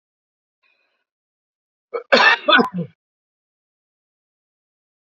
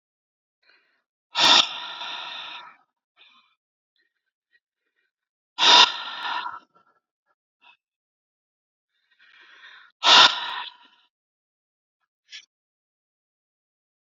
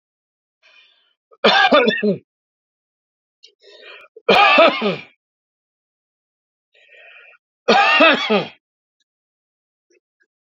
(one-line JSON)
{"cough_length": "5.1 s", "cough_amplitude": 27850, "cough_signal_mean_std_ratio": 0.26, "exhalation_length": "14.1 s", "exhalation_amplitude": 28695, "exhalation_signal_mean_std_ratio": 0.24, "three_cough_length": "10.5 s", "three_cough_amplitude": 30232, "three_cough_signal_mean_std_ratio": 0.36, "survey_phase": "beta (2021-08-13 to 2022-03-07)", "age": "45-64", "gender": "Male", "wearing_mask": "No", "symptom_cough_any": true, "symptom_runny_or_blocked_nose": true, "symptom_sore_throat": true, "symptom_change_to_sense_of_smell_or_taste": true, "symptom_onset": "3 days", "smoker_status": "Ex-smoker", "respiratory_condition_asthma": false, "respiratory_condition_other": false, "recruitment_source": "Test and Trace", "submission_delay": "2 days", "covid_test_result": "Positive", "covid_test_method": "RT-qPCR", "covid_ct_value": 19.5, "covid_ct_gene": "N gene"}